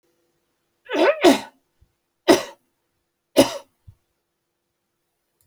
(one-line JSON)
{"three_cough_length": "5.5 s", "three_cough_amplitude": 31357, "three_cough_signal_mean_std_ratio": 0.26, "survey_phase": "beta (2021-08-13 to 2022-03-07)", "age": "65+", "gender": "Female", "wearing_mask": "No", "symptom_cough_any": true, "symptom_sore_throat": true, "smoker_status": "Never smoked", "respiratory_condition_asthma": false, "respiratory_condition_other": false, "recruitment_source": "REACT", "submission_delay": "1 day", "covid_test_result": "Negative", "covid_test_method": "RT-qPCR"}